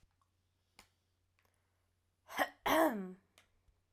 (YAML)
cough_length: 3.9 s
cough_amplitude: 4452
cough_signal_mean_std_ratio: 0.29
survey_phase: alpha (2021-03-01 to 2021-08-12)
age: 18-44
gender: Female
wearing_mask: 'No'
symptom_none: true
smoker_status: Ex-smoker
respiratory_condition_asthma: false
respiratory_condition_other: false
recruitment_source: REACT
submission_delay: 2 days
covid_test_result: Negative
covid_test_method: RT-qPCR